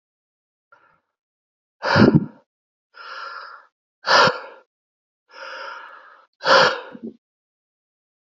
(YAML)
exhalation_length: 8.3 s
exhalation_amplitude: 28611
exhalation_signal_mean_std_ratio: 0.3
survey_phase: beta (2021-08-13 to 2022-03-07)
age: 18-44
gender: Male
wearing_mask: 'No'
symptom_cough_any: true
symptom_change_to_sense_of_smell_or_taste: true
symptom_loss_of_taste: true
symptom_onset: 3 days
smoker_status: Never smoked
respiratory_condition_asthma: false
respiratory_condition_other: false
recruitment_source: Test and Trace
submission_delay: 2 days
covid_test_result: Positive
covid_test_method: RT-qPCR
covid_ct_value: 23.0
covid_ct_gene: S gene
covid_ct_mean: 23.1
covid_viral_load: 26000 copies/ml
covid_viral_load_category: Low viral load (10K-1M copies/ml)